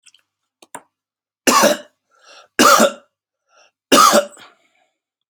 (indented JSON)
{
  "three_cough_length": "5.3 s",
  "three_cough_amplitude": 32767,
  "three_cough_signal_mean_std_ratio": 0.35,
  "survey_phase": "beta (2021-08-13 to 2022-03-07)",
  "age": "45-64",
  "gender": "Male",
  "wearing_mask": "No",
  "symptom_cough_any": true,
  "symptom_runny_or_blocked_nose": true,
  "symptom_shortness_of_breath": true,
  "symptom_sore_throat": true,
  "symptom_abdominal_pain": true,
  "symptom_fatigue": true,
  "symptom_fever_high_temperature": true,
  "symptom_headache": true,
  "symptom_change_to_sense_of_smell_or_taste": true,
  "symptom_loss_of_taste": true,
  "symptom_onset": "3 days",
  "smoker_status": "Ex-smoker",
  "respiratory_condition_asthma": false,
  "respiratory_condition_other": false,
  "recruitment_source": "Test and Trace",
  "submission_delay": "2 days",
  "covid_test_result": "Positive",
  "covid_test_method": "RT-qPCR",
  "covid_ct_value": 18.0,
  "covid_ct_gene": "ORF1ab gene",
  "covid_ct_mean": 19.3,
  "covid_viral_load": "480000 copies/ml",
  "covid_viral_load_category": "Low viral load (10K-1M copies/ml)"
}